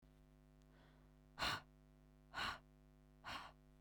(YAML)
exhalation_length: 3.8 s
exhalation_amplitude: 1156
exhalation_signal_mean_std_ratio: 0.44
survey_phase: beta (2021-08-13 to 2022-03-07)
age: 18-44
gender: Female
wearing_mask: 'No'
symptom_none: true
symptom_onset: 4 days
smoker_status: Never smoked
respiratory_condition_asthma: true
respiratory_condition_other: false
recruitment_source: REACT
submission_delay: 2 days
covid_test_result: Negative
covid_test_method: RT-qPCR
influenza_a_test_result: Negative
influenza_b_test_result: Negative